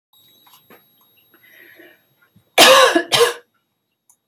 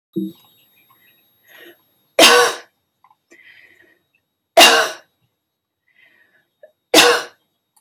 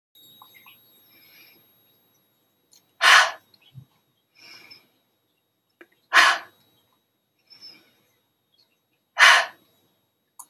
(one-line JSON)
{"cough_length": "4.3 s", "cough_amplitude": 32767, "cough_signal_mean_std_ratio": 0.32, "three_cough_length": "7.8 s", "three_cough_amplitude": 32767, "three_cough_signal_mean_std_ratio": 0.29, "exhalation_length": "10.5 s", "exhalation_amplitude": 29376, "exhalation_signal_mean_std_ratio": 0.22, "survey_phase": "alpha (2021-03-01 to 2021-08-12)", "age": "45-64", "gender": "Female", "wearing_mask": "No", "symptom_fatigue": true, "symptom_onset": "8 days", "smoker_status": "Prefer not to say", "respiratory_condition_asthma": false, "respiratory_condition_other": false, "recruitment_source": "REACT", "submission_delay": "1 day", "covid_test_result": "Negative", "covid_test_method": "RT-qPCR"}